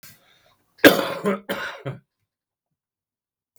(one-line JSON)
{"cough_length": "3.6 s", "cough_amplitude": 32768, "cough_signal_mean_std_ratio": 0.26, "survey_phase": "beta (2021-08-13 to 2022-03-07)", "age": "65+", "gender": "Male", "wearing_mask": "No", "symptom_cough_any": true, "smoker_status": "Current smoker (11 or more cigarettes per day)", "respiratory_condition_asthma": false, "respiratory_condition_other": false, "recruitment_source": "REACT", "submission_delay": "6 days", "covid_test_result": "Negative", "covid_test_method": "RT-qPCR", "influenza_a_test_result": "Negative", "influenza_b_test_result": "Negative"}